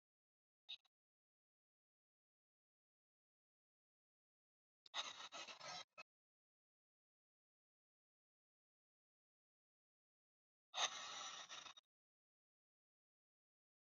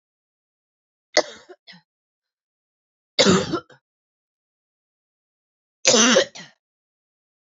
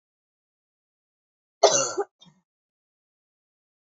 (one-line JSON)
{"exhalation_length": "14.0 s", "exhalation_amplitude": 1365, "exhalation_signal_mean_std_ratio": 0.24, "three_cough_length": "7.4 s", "three_cough_amplitude": 32603, "three_cough_signal_mean_std_ratio": 0.26, "cough_length": "3.8 s", "cough_amplitude": 24929, "cough_signal_mean_std_ratio": 0.21, "survey_phase": "beta (2021-08-13 to 2022-03-07)", "age": "18-44", "gender": "Female", "wearing_mask": "No", "symptom_shortness_of_breath": true, "symptom_sore_throat": true, "symptom_diarrhoea": true, "smoker_status": "Never smoked", "respiratory_condition_asthma": true, "respiratory_condition_other": false, "recruitment_source": "REACT", "submission_delay": "0 days", "covid_test_result": "Positive", "covid_test_method": "RT-qPCR", "covid_ct_value": 28.0, "covid_ct_gene": "E gene", "influenza_a_test_result": "Negative", "influenza_b_test_result": "Negative"}